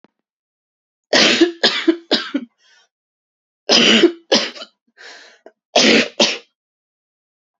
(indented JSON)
{
  "three_cough_length": "7.6 s",
  "three_cough_amplitude": 31549,
  "three_cough_signal_mean_std_ratio": 0.41,
  "survey_phase": "beta (2021-08-13 to 2022-03-07)",
  "age": "18-44",
  "gender": "Female",
  "wearing_mask": "No",
  "symptom_cough_any": true,
  "symptom_runny_or_blocked_nose": true,
  "symptom_shortness_of_breath": true,
  "symptom_sore_throat": true,
  "symptom_abdominal_pain": true,
  "symptom_diarrhoea": true,
  "symptom_fatigue": true,
  "symptom_fever_high_temperature": true,
  "symptom_headache": true,
  "symptom_change_to_sense_of_smell_or_taste": true,
  "symptom_onset": "13 days",
  "smoker_status": "Never smoked",
  "respiratory_condition_asthma": true,
  "respiratory_condition_other": false,
  "recruitment_source": "Test and Trace",
  "submission_delay": "1 day",
  "covid_test_result": "Positive",
  "covid_test_method": "RT-qPCR",
  "covid_ct_value": 28.4,
  "covid_ct_gene": "ORF1ab gene"
}